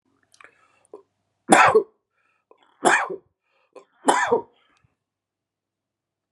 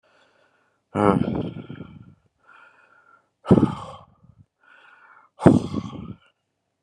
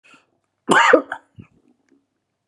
{"three_cough_length": "6.3 s", "three_cough_amplitude": 32672, "three_cough_signal_mean_std_ratio": 0.29, "exhalation_length": "6.8 s", "exhalation_amplitude": 32768, "exhalation_signal_mean_std_ratio": 0.28, "cough_length": "2.5 s", "cough_amplitude": 32722, "cough_signal_mean_std_ratio": 0.3, "survey_phase": "beta (2021-08-13 to 2022-03-07)", "age": "65+", "gender": "Male", "wearing_mask": "No", "symptom_cough_any": true, "symptom_runny_or_blocked_nose": true, "symptom_sore_throat": true, "symptom_fatigue": true, "symptom_fever_high_temperature": true, "symptom_change_to_sense_of_smell_or_taste": true, "smoker_status": "Ex-smoker", "respiratory_condition_asthma": false, "respiratory_condition_other": false, "recruitment_source": "Test and Trace", "submission_delay": "2 days", "covid_test_result": "Positive", "covid_test_method": "LFT"}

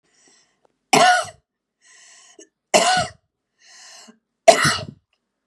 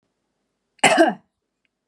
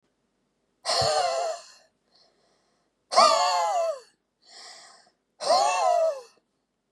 {"three_cough_length": "5.5 s", "three_cough_amplitude": 32768, "three_cough_signal_mean_std_ratio": 0.32, "cough_length": "1.9 s", "cough_amplitude": 30986, "cough_signal_mean_std_ratio": 0.31, "exhalation_length": "6.9 s", "exhalation_amplitude": 17734, "exhalation_signal_mean_std_ratio": 0.49, "survey_phase": "beta (2021-08-13 to 2022-03-07)", "age": "45-64", "gender": "Female", "wearing_mask": "No", "symptom_none": true, "smoker_status": "Ex-smoker", "respiratory_condition_asthma": false, "respiratory_condition_other": false, "recruitment_source": "REACT", "submission_delay": "2 days", "covid_test_result": "Positive", "covid_test_method": "RT-qPCR", "covid_ct_value": 36.9, "covid_ct_gene": "N gene", "influenza_a_test_result": "Negative", "influenza_b_test_result": "Negative"}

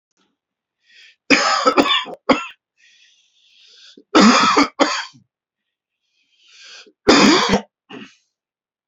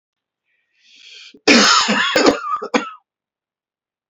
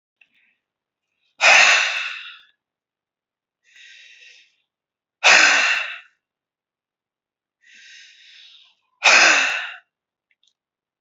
{"three_cough_length": "8.9 s", "three_cough_amplitude": 31945, "three_cough_signal_mean_std_ratio": 0.39, "cough_length": "4.1 s", "cough_amplitude": 32331, "cough_signal_mean_std_ratio": 0.43, "exhalation_length": "11.0 s", "exhalation_amplitude": 31936, "exhalation_signal_mean_std_ratio": 0.33, "survey_phase": "beta (2021-08-13 to 2022-03-07)", "age": "45-64", "gender": "Male", "wearing_mask": "No", "symptom_cough_any": true, "symptom_runny_or_blocked_nose": true, "symptom_headache": true, "smoker_status": "Never smoked", "respiratory_condition_asthma": false, "respiratory_condition_other": false, "recruitment_source": "Test and Trace", "submission_delay": "2 days", "covid_test_result": "Positive", "covid_test_method": "RT-qPCR"}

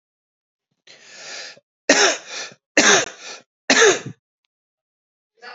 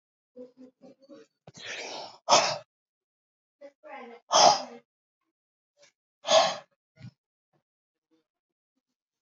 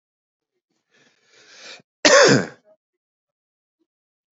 {"three_cough_length": "5.5 s", "three_cough_amplitude": 31254, "three_cough_signal_mean_std_ratio": 0.35, "exhalation_length": "9.2 s", "exhalation_amplitude": 18518, "exhalation_signal_mean_std_ratio": 0.26, "cough_length": "4.4 s", "cough_amplitude": 30133, "cough_signal_mean_std_ratio": 0.25, "survey_phase": "alpha (2021-03-01 to 2021-08-12)", "age": "18-44", "gender": "Male", "wearing_mask": "No", "symptom_cough_any": true, "symptom_headache": true, "smoker_status": "Never smoked", "respiratory_condition_asthma": false, "respiratory_condition_other": false, "recruitment_source": "Test and Trace", "submission_delay": "2 days", "covid_test_result": "Positive", "covid_test_method": "RT-qPCR"}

